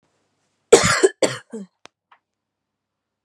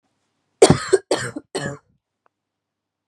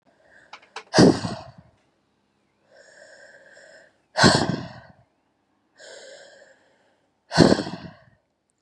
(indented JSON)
{
  "cough_length": "3.2 s",
  "cough_amplitude": 32768,
  "cough_signal_mean_std_ratio": 0.26,
  "three_cough_length": "3.1 s",
  "three_cough_amplitude": 32767,
  "three_cough_signal_mean_std_ratio": 0.27,
  "exhalation_length": "8.6 s",
  "exhalation_amplitude": 32550,
  "exhalation_signal_mean_std_ratio": 0.27,
  "survey_phase": "beta (2021-08-13 to 2022-03-07)",
  "age": "18-44",
  "gender": "Female",
  "wearing_mask": "No",
  "symptom_cough_any": true,
  "symptom_runny_or_blocked_nose": true,
  "symptom_shortness_of_breath": true,
  "symptom_sore_throat": true,
  "symptom_fatigue": true,
  "symptom_fever_high_temperature": true,
  "symptom_headache": true,
  "symptom_onset": "3 days",
  "smoker_status": "Never smoked",
  "respiratory_condition_asthma": true,
  "respiratory_condition_other": false,
  "recruitment_source": "Test and Trace",
  "submission_delay": "2 days",
  "covid_test_result": "Positive",
  "covid_test_method": "ePCR"
}